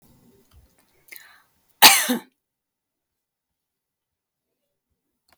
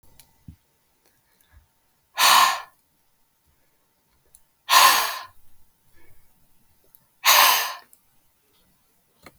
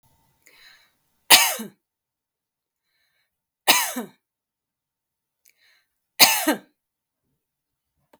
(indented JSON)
{
  "cough_length": "5.4 s",
  "cough_amplitude": 32768,
  "cough_signal_mean_std_ratio": 0.17,
  "exhalation_length": "9.4 s",
  "exhalation_amplitude": 28185,
  "exhalation_signal_mean_std_ratio": 0.3,
  "three_cough_length": "8.2 s",
  "three_cough_amplitude": 32768,
  "three_cough_signal_mean_std_ratio": 0.22,
  "survey_phase": "beta (2021-08-13 to 2022-03-07)",
  "age": "45-64",
  "gender": "Female",
  "wearing_mask": "No",
  "symptom_none": true,
  "smoker_status": "Never smoked",
  "respiratory_condition_asthma": false,
  "respiratory_condition_other": false,
  "recruitment_source": "REACT",
  "submission_delay": "2 days",
  "covid_test_result": "Negative",
  "covid_test_method": "RT-qPCR",
  "influenza_a_test_result": "Negative",
  "influenza_b_test_result": "Negative"
}